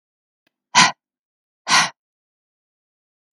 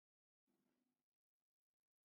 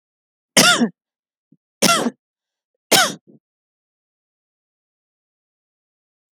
{"exhalation_length": "3.3 s", "exhalation_amplitude": 32768, "exhalation_signal_mean_std_ratio": 0.25, "cough_length": "2.0 s", "cough_amplitude": 6, "cough_signal_mean_std_ratio": 0.36, "three_cough_length": "6.3 s", "three_cough_amplitude": 32768, "three_cough_signal_mean_std_ratio": 0.27, "survey_phase": "beta (2021-08-13 to 2022-03-07)", "age": "65+", "gender": "Female", "wearing_mask": "No", "symptom_none": true, "symptom_onset": "7 days", "smoker_status": "Ex-smoker", "respiratory_condition_asthma": false, "respiratory_condition_other": false, "recruitment_source": "REACT", "submission_delay": "2 days", "covid_test_result": "Negative", "covid_test_method": "RT-qPCR", "influenza_a_test_result": "Negative", "influenza_b_test_result": "Negative"}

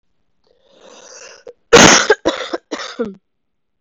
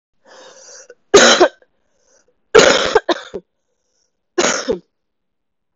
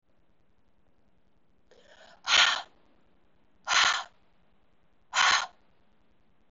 {"cough_length": "3.8 s", "cough_amplitude": 32768, "cough_signal_mean_std_ratio": 0.33, "three_cough_length": "5.8 s", "three_cough_amplitude": 32768, "three_cough_signal_mean_std_ratio": 0.34, "exhalation_length": "6.5 s", "exhalation_amplitude": 12942, "exhalation_signal_mean_std_ratio": 0.32, "survey_phase": "beta (2021-08-13 to 2022-03-07)", "age": "18-44", "gender": "Female", "wearing_mask": "No", "symptom_cough_any": true, "symptom_runny_or_blocked_nose": true, "symptom_fatigue": true, "symptom_headache": true, "symptom_onset": "2 days", "smoker_status": "Never smoked", "respiratory_condition_asthma": false, "respiratory_condition_other": false, "recruitment_source": "Test and Trace", "submission_delay": "2 days", "covid_test_result": "Positive", "covid_test_method": "RT-qPCR", "covid_ct_value": 34.4, "covid_ct_gene": "ORF1ab gene"}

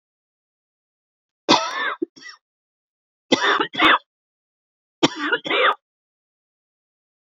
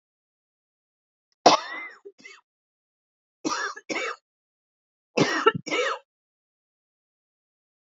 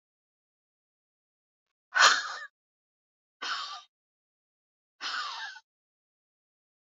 {"cough_length": "7.3 s", "cough_amplitude": 28482, "cough_signal_mean_std_ratio": 0.34, "three_cough_length": "7.9 s", "three_cough_amplitude": 27253, "three_cough_signal_mean_std_ratio": 0.28, "exhalation_length": "6.9 s", "exhalation_amplitude": 18254, "exhalation_signal_mean_std_ratio": 0.24, "survey_phase": "alpha (2021-03-01 to 2021-08-12)", "age": "45-64", "gender": "Female", "wearing_mask": "No", "symptom_none": true, "smoker_status": "Ex-smoker", "respiratory_condition_asthma": false, "respiratory_condition_other": false, "recruitment_source": "REACT", "submission_delay": "2 days", "covid_test_method": "RT-qPCR"}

